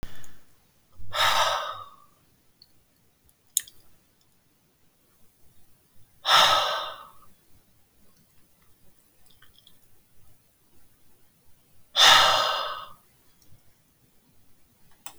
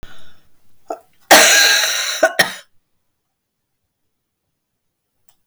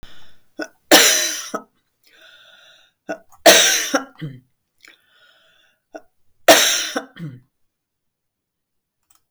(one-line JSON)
{"exhalation_length": "15.2 s", "exhalation_amplitude": 32768, "exhalation_signal_mean_std_ratio": 0.33, "cough_length": "5.5 s", "cough_amplitude": 32768, "cough_signal_mean_std_ratio": 0.36, "three_cough_length": "9.3 s", "three_cough_amplitude": 32768, "three_cough_signal_mean_std_ratio": 0.32, "survey_phase": "alpha (2021-03-01 to 2021-08-12)", "age": "65+", "gender": "Female", "wearing_mask": "No", "symptom_none": true, "smoker_status": "Never smoked", "respiratory_condition_asthma": false, "respiratory_condition_other": false, "recruitment_source": "REACT", "submission_delay": "3 days", "covid_test_result": "Negative", "covid_test_method": "RT-qPCR"}